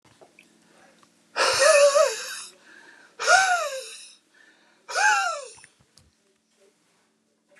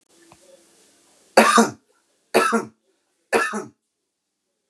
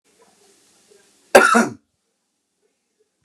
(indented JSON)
{
  "exhalation_length": "7.6 s",
  "exhalation_amplitude": 21805,
  "exhalation_signal_mean_std_ratio": 0.41,
  "three_cough_length": "4.7 s",
  "three_cough_amplitude": 32709,
  "three_cough_signal_mean_std_ratio": 0.32,
  "cough_length": "3.2 s",
  "cough_amplitude": 32768,
  "cough_signal_mean_std_ratio": 0.25,
  "survey_phase": "beta (2021-08-13 to 2022-03-07)",
  "age": "45-64",
  "gender": "Male",
  "wearing_mask": "No",
  "symptom_abdominal_pain": true,
  "symptom_headache": true,
  "smoker_status": "Ex-smoker",
  "respiratory_condition_asthma": false,
  "respiratory_condition_other": false,
  "recruitment_source": "REACT",
  "submission_delay": "7 days",
  "covid_test_result": "Negative",
  "covid_test_method": "RT-qPCR"
}